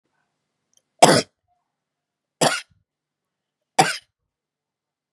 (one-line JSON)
{"three_cough_length": "5.1 s", "three_cough_amplitude": 32768, "three_cough_signal_mean_std_ratio": 0.21, "survey_phase": "beta (2021-08-13 to 2022-03-07)", "age": "18-44", "gender": "Female", "wearing_mask": "No", "symptom_none": true, "smoker_status": "Never smoked", "respiratory_condition_asthma": false, "respiratory_condition_other": false, "recruitment_source": "REACT", "submission_delay": "2 days", "covid_test_result": "Negative", "covid_test_method": "RT-qPCR", "influenza_a_test_result": "Negative", "influenza_b_test_result": "Negative"}